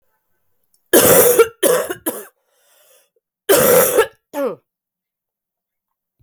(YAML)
three_cough_length: 6.2 s
three_cough_amplitude: 32768
three_cough_signal_mean_std_ratio: 0.42
survey_phase: beta (2021-08-13 to 2022-03-07)
age: 18-44
gender: Female
wearing_mask: 'No'
symptom_cough_any: true
symptom_runny_or_blocked_nose: true
symptom_headache: true
smoker_status: Ex-smoker
respiratory_condition_asthma: false
respiratory_condition_other: false
recruitment_source: Test and Trace
submission_delay: 2 days
covid_test_result: Positive
covid_test_method: LFT